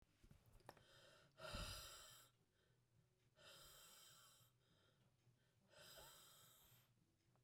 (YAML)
exhalation_length: 7.4 s
exhalation_amplitude: 343
exhalation_signal_mean_std_ratio: 0.53
survey_phase: beta (2021-08-13 to 2022-03-07)
age: 45-64
gender: Female
wearing_mask: 'No'
symptom_cough_any: true
symptom_runny_or_blocked_nose: true
symptom_sore_throat: true
symptom_fatigue: true
symptom_headache: true
smoker_status: Never smoked
respiratory_condition_asthma: false
respiratory_condition_other: false
recruitment_source: Test and Trace
submission_delay: 2 days
covid_test_result: Positive
covid_test_method: LFT